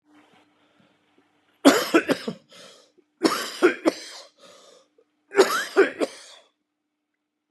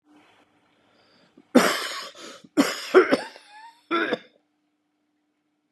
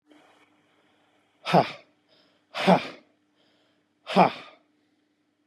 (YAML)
three_cough_length: 7.5 s
three_cough_amplitude: 29019
three_cough_signal_mean_std_ratio: 0.32
cough_length: 5.7 s
cough_amplitude: 26377
cough_signal_mean_std_ratio: 0.32
exhalation_length: 5.5 s
exhalation_amplitude: 24765
exhalation_signal_mean_std_ratio: 0.25
survey_phase: beta (2021-08-13 to 2022-03-07)
age: 45-64
gender: Male
wearing_mask: 'No'
symptom_cough_any: true
symptom_runny_or_blocked_nose: true
symptom_sore_throat: true
symptom_onset: 4 days
smoker_status: Never smoked
respiratory_condition_asthma: false
respiratory_condition_other: false
recruitment_source: Test and Trace
submission_delay: 2 days
covid_test_result: Negative
covid_test_method: RT-qPCR